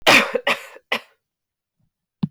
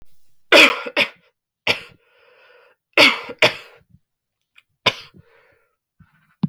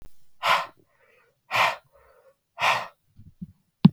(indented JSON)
{
  "cough_length": "2.3 s",
  "cough_amplitude": 32768,
  "cough_signal_mean_std_ratio": 0.34,
  "three_cough_length": "6.5 s",
  "three_cough_amplitude": 32768,
  "three_cough_signal_mean_std_ratio": 0.28,
  "exhalation_length": "3.9 s",
  "exhalation_amplitude": 30228,
  "exhalation_signal_mean_std_ratio": 0.31,
  "survey_phase": "beta (2021-08-13 to 2022-03-07)",
  "age": "18-44",
  "gender": "Female",
  "wearing_mask": "No",
  "symptom_cough_any": true,
  "symptom_new_continuous_cough": true,
  "symptom_runny_or_blocked_nose": true,
  "symptom_fatigue": true,
  "symptom_headache": true,
  "symptom_change_to_sense_of_smell_or_taste": true,
  "symptom_onset": "4 days",
  "smoker_status": "Never smoked",
  "respiratory_condition_asthma": false,
  "respiratory_condition_other": false,
  "recruitment_source": "Test and Trace",
  "submission_delay": "1 day",
  "covid_test_result": "Positive",
  "covid_test_method": "RT-qPCR",
  "covid_ct_value": 13.9,
  "covid_ct_gene": "ORF1ab gene",
  "covid_ct_mean": 14.1,
  "covid_viral_load": "24000000 copies/ml",
  "covid_viral_load_category": "High viral load (>1M copies/ml)"
}